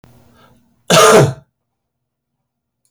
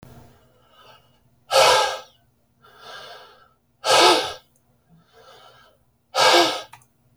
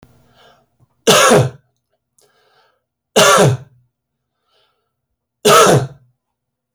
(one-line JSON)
{"cough_length": "2.9 s", "cough_amplitude": 32768, "cough_signal_mean_std_ratio": 0.33, "exhalation_length": "7.2 s", "exhalation_amplitude": 27258, "exhalation_signal_mean_std_ratio": 0.36, "three_cough_length": "6.7 s", "three_cough_amplitude": 32454, "three_cough_signal_mean_std_ratio": 0.37, "survey_phase": "beta (2021-08-13 to 2022-03-07)", "age": "45-64", "gender": "Male", "wearing_mask": "No", "symptom_none": true, "smoker_status": "Never smoked", "respiratory_condition_asthma": false, "respiratory_condition_other": false, "recruitment_source": "REACT", "submission_delay": "2 days", "covid_test_result": "Negative", "covid_test_method": "RT-qPCR"}